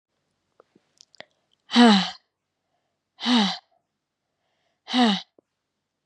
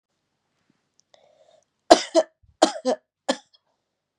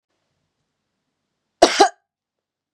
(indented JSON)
{
  "exhalation_length": "6.1 s",
  "exhalation_amplitude": 26815,
  "exhalation_signal_mean_std_ratio": 0.3,
  "three_cough_length": "4.2 s",
  "three_cough_amplitude": 32768,
  "three_cough_signal_mean_std_ratio": 0.21,
  "cough_length": "2.7 s",
  "cough_amplitude": 32768,
  "cough_signal_mean_std_ratio": 0.2,
  "survey_phase": "beta (2021-08-13 to 2022-03-07)",
  "age": "18-44",
  "gender": "Female",
  "wearing_mask": "No",
  "symptom_cough_any": true,
  "symptom_runny_or_blocked_nose": true,
  "symptom_sore_throat": true,
  "symptom_fatigue": true,
  "symptom_onset": "4 days",
  "smoker_status": "Never smoked",
  "respiratory_condition_asthma": false,
  "respiratory_condition_other": false,
  "recruitment_source": "Test and Trace",
  "submission_delay": "2 days",
  "covid_test_result": "Positive",
  "covid_test_method": "RT-qPCR",
  "covid_ct_value": 16.7,
  "covid_ct_gene": "N gene",
  "covid_ct_mean": 16.8,
  "covid_viral_load": "3100000 copies/ml",
  "covid_viral_load_category": "High viral load (>1M copies/ml)"
}